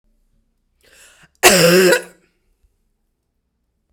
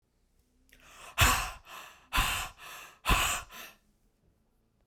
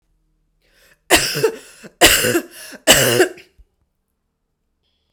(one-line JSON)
{"cough_length": "3.9 s", "cough_amplitude": 32768, "cough_signal_mean_std_ratio": 0.32, "exhalation_length": "4.9 s", "exhalation_amplitude": 12662, "exhalation_signal_mean_std_ratio": 0.39, "three_cough_length": "5.1 s", "three_cough_amplitude": 32768, "three_cough_signal_mean_std_ratio": 0.38, "survey_phase": "beta (2021-08-13 to 2022-03-07)", "age": "18-44", "gender": "Female", "wearing_mask": "No", "symptom_none": true, "smoker_status": "Never smoked", "respiratory_condition_asthma": false, "respiratory_condition_other": false, "recruitment_source": "REACT", "submission_delay": "2 days", "covid_test_result": "Negative", "covid_test_method": "RT-qPCR"}